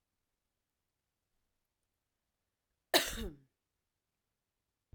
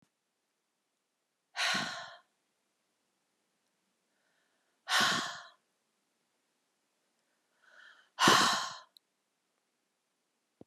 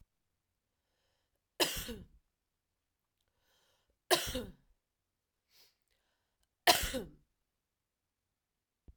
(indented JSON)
{
  "cough_length": "4.9 s",
  "cough_amplitude": 7765,
  "cough_signal_mean_std_ratio": 0.16,
  "exhalation_length": "10.7 s",
  "exhalation_amplitude": 12271,
  "exhalation_signal_mean_std_ratio": 0.27,
  "three_cough_length": "9.0 s",
  "three_cough_amplitude": 9305,
  "three_cough_signal_mean_std_ratio": 0.21,
  "survey_phase": "beta (2021-08-13 to 2022-03-07)",
  "age": "18-44",
  "gender": "Female",
  "wearing_mask": "No",
  "symptom_cough_any": true,
  "symptom_runny_or_blocked_nose": true,
  "symptom_fatigue": true,
  "smoker_status": "Current smoker (1 to 10 cigarettes per day)",
  "respiratory_condition_asthma": false,
  "respiratory_condition_other": false,
  "recruitment_source": "Test and Trace",
  "submission_delay": "2 days",
  "covid_test_result": "Positive",
  "covid_test_method": "ePCR"
}